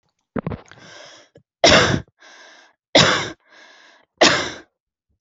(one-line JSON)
{"three_cough_length": "5.2 s", "three_cough_amplitude": 31651, "three_cough_signal_mean_std_ratio": 0.35, "survey_phase": "alpha (2021-03-01 to 2021-08-12)", "age": "18-44", "gender": "Female", "wearing_mask": "No", "symptom_none": true, "smoker_status": "Never smoked", "respiratory_condition_asthma": false, "respiratory_condition_other": false, "recruitment_source": "REACT", "submission_delay": "1 day", "covid_test_result": "Negative", "covid_test_method": "RT-qPCR"}